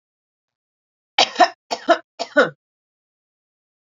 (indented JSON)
{
  "three_cough_length": "3.9 s",
  "three_cough_amplitude": 28761,
  "three_cough_signal_mean_std_ratio": 0.25,
  "survey_phase": "alpha (2021-03-01 to 2021-08-12)",
  "age": "45-64",
  "gender": "Female",
  "wearing_mask": "No",
  "symptom_none": true,
  "smoker_status": "Ex-smoker",
  "respiratory_condition_asthma": false,
  "respiratory_condition_other": false,
  "recruitment_source": "REACT",
  "submission_delay": "3 days",
  "covid_test_result": "Negative",
  "covid_test_method": "RT-qPCR"
}